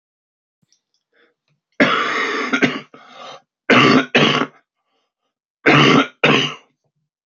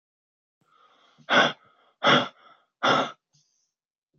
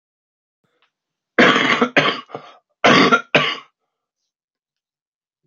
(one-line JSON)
{"three_cough_length": "7.3 s", "three_cough_amplitude": 32768, "three_cough_signal_mean_std_ratio": 0.45, "exhalation_length": "4.2 s", "exhalation_amplitude": 15077, "exhalation_signal_mean_std_ratio": 0.33, "cough_length": "5.5 s", "cough_amplitude": 30235, "cough_signal_mean_std_ratio": 0.37, "survey_phase": "beta (2021-08-13 to 2022-03-07)", "age": "18-44", "gender": "Male", "wearing_mask": "No", "symptom_cough_any": true, "symptom_new_continuous_cough": true, "symptom_sore_throat": true, "symptom_change_to_sense_of_smell_or_taste": true, "symptom_loss_of_taste": true, "symptom_onset": "7 days", "smoker_status": "Ex-smoker", "respiratory_condition_asthma": false, "respiratory_condition_other": false, "recruitment_source": "Test and Trace", "submission_delay": "2 days", "covid_test_result": "Positive", "covid_test_method": "RT-qPCR"}